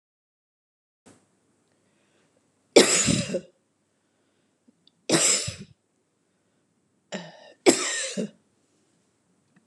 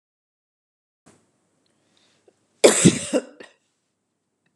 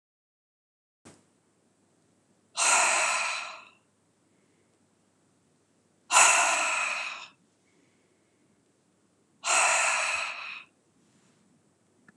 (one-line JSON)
{"three_cough_length": "9.7 s", "three_cough_amplitude": 30103, "three_cough_signal_mean_std_ratio": 0.28, "cough_length": "4.6 s", "cough_amplitude": 32767, "cough_signal_mean_std_ratio": 0.22, "exhalation_length": "12.2 s", "exhalation_amplitude": 17112, "exhalation_signal_mean_std_ratio": 0.39, "survey_phase": "beta (2021-08-13 to 2022-03-07)", "age": "65+", "gender": "Female", "wearing_mask": "No", "symptom_none": true, "smoker_status": "Never smoked", "respiratory_condition_asthma": false, "respiratory_condition_other": false, "recruitment_source": "REACT", "submission_delay": "2 days", "covid_test_result": "Negative", "covid_test_method": "RT-qPCR", "influenza_a_test_result": "Negative", "influenza_b_test_result": "Negative"}